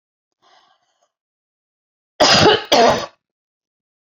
{
  "cough_length": "4.1 s",
  "cough_amplitude": 31281,
  "cough_signal_mean_std_ratio": 0.34,
  "survey_phase": "beta (2021-08-13 to 2022-03-07)",
  "age": "45-64",
  "gender": "Female",
  "wearing_mask": "No",
  "symptom_none": true,
  "symptom_onset": "7 days",
  "smoker_status": "Never smoked",
  "respiratory_condition_asthma": false,
  "respiratory_condition_other": false,
  "recruitment_source": "REACT",
  "submission_delay": "1 day",
  "covid_test_result": "Negative",
  "covid_test_method": "RT-qPCR"
}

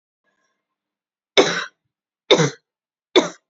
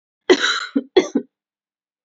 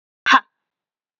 {
  "three_cough_length": "3.5 s",
  "three_cough_amplitude": 31489,
  "three_cough_signal_mean_std_ratio": 0.28,
  "cough_length": "2.0 s",
  "cough_amplitude": 27727,
  "cough_signal_mean_std_ratio": 0.36,
  "exhalation_length": "1.2 s",
  "exhalation_amplitude": 27919,
  "exhalation_signal_mean_std_ratio": 0.25,
  "survey_phase": "beta (2021-08-13 to 2022-03-07)",
  "age": "18-44",
  "gender": "Female",
  "wearing_mask": "No",
  "symptom_cough_any": true,
  "symptom_runny_or_blocked_nose": true,
  "symptom_diarrhoea": true,
  "symptom_fatigue": true,
  "symptom_fever_high_temperature": true,
  "symptom_headache": true,
  "symptom_other": true,
  "smoker_status": "Never smoked",
  "respiratory_condition_asthma": false,
  "respiratory_condition_other": false,
  "recruitment_source": "Test and Trace",
  "submission_delay": "2 days",
  "covid_test_result": "Positive",
  "covid_test_method": "LFT"
}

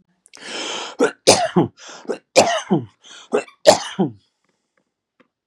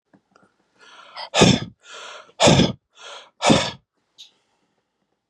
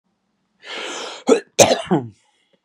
{
  "three_cough_length": "5.5 s",
  "three_cough_amplitude": 32768,
  "three_cough_signal_mean_std_ratio": 0.39,
  "exhalation_length": "5.3 s",
  "exhalation_amplitude": 32339,
  "exhalation_signal_mean_std_ratio": 0.33,
  "cough_length": "2.6 s",
  "cough_amplitude": 32768,
  "cough_signal_mean_std_ratio": 0.36,
  "survey_phase": "beta (2021-08-13 to 2022-03-07)",
  "age": "45-64",
  "gender": "Male",
  "wearing_mask": "No",
  "symptom_cough_any": true,
  "smoker_status": "Ex-smoker",
  "respiratory_condition_asthma": false,
  "respiratory_condition_other": false,
  "recruitment_source": "REACT",
  "submission_delay": "2 days",
  "covid_test_result": "Negative",
  "covid_test_method": "RT-qPCR",
  "influenza_a_test_result": "Negative",
  "influenza_b_test_result": "Negative"
}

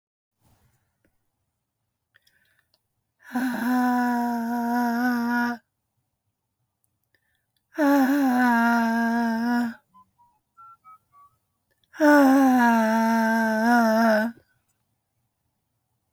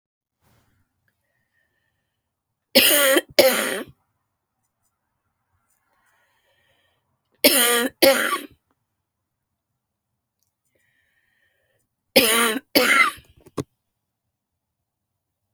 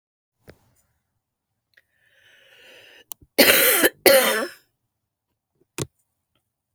{
  "exhalation_length": "16.1 s",
  "exhalation_amplitude": 17234,
  "exhalation_signal_mean_std_ratio": 0.58,
  "three_cough_length": "15.5 s",
  "three_cough_amplitude": 32768,
  "three_cough_signal_mean_std_ratio": 0.31,
  "cough_length": "6.7 s",
  "cough_amplitude": 32768,
  "cough_signal_mean_std_ratio": 0.29,
  "survey_phase": "beta (2021-08-13 to 2022-03-07)",
  "age": "45-64",
  "gender": "Male",
  "wearing_mask": "No",
  "symptom_cough_any": true,
  "symptom_sore_throat": true,
  "symptom_headache": true,
  "symptom_loss_of_taste": true,
  "smoker_status": "Never smoked",
  "respiratory_condition_asthma": false,
  "respiratory_condition_other": false,
  "recruitment_source": "Test and Trace",
  "submission_delay": "3 days",
  "covid_test_result": "Positive",
  "covid_test_method": "RT-qPCR",
  "covid_ct_value": 21.4,
  "covid_ct_gene": "ORF1ab gene",
  "covid_ct_mean": 21.5,
  "covid_viral_load": "91000 copies/ml",
  "covid_viral_load_category": "Low viral load (10K-1M copies/ml)"
}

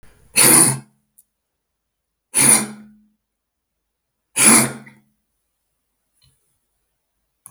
{
  "three_cough_length": "7.5 s",
  "three_cough_amplitude": 32768,
  "three_cough_signal_mean_std_ratio": 0.3,
  "survey_phase": "beta (2021-08-13 to 2022-03-07)",
  "age": "65+",
  "gender": "Male",
  "wearing_mask": "No",
  "symptom_cough_any": true,
  "smoker_status": "Never smoked",
  "respiratory_condition_asthma": false,
  "respiratory_condition_other": false,
  "recruitment_source": "REACT",
  "submission_delay": "1 day",
  "covid_test_result": "Negative",
  "covid_test_method": "RT-qPCR",
  "influenza_a_test_result": "Negative",
  "influenza_b_test_result": "Negative"
}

